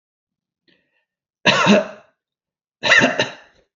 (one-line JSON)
{"three_cough_length": "3.8 s", "three_cough_amplitude": 30047, "three_cough_signal_mean_std_ratio": 0.37, "survey_phase": "beta (2021-08-13 to 2022-03-07)", "age": "45-64", "gender": "Male", "wearing_mask": "No", "symptom_none": true, "smoker_status": "Never smoked", "respiratory_condition_asthma": false, "respiratory_condition_other": false, "recruitment_source": "REACT", "submission_delay": "2 days", "covid_test_result": "Negative", "covid_test_method": "RT-qPCR", "influenza_a_test_result": "Negative", "influenza_b_test_result": "Negative"}